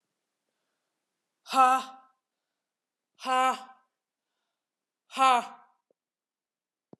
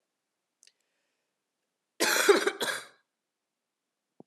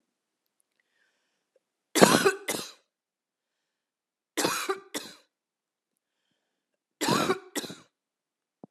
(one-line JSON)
{"exhalation_length": "7.0 s", "exhalation_amplitude": 12817, "exhalation_signal_mean_std_ratio": 0.26, "cough_length": "4.3 s", "cough_amplitude": 15119, "cough_signal_mean_std_ratio": 0.29, "three_cough_length": "8.7 s", "three_cough_amplitude": 30645, "three_cough_signal_mean_std_ratio": 0.27, "survey_phase": "beta (2021-08-13 to 2022-03-07)", "age": "45-64", "gender": "Female", "wearing_mask": "No", "symptom_cough_any": true, "symptom_new_continuous_cough": true, "symptom_sore_throat": true, "symptom_fatigue": true, "symptom_other": true, "symptom_onset": "4 days", "smoker_status": "Never smoked", "respiratory_condition_asthma": false, "respiratory_condition_other": false, "recruitment_source": "Test and Trace", "submission_delay": "2 days", "covid_test_result": "Positive", "covid_test_method": "RT-qPCR", "covid_ct_value": 23.1, "covid_ct_gene": "ORF1ab gene", "covid_ct_mean": 23.6, "covid_viral_load": "18000 copies/ml", "covid_viral_load_category": "Low viral load (10K-1M copies/ml)"}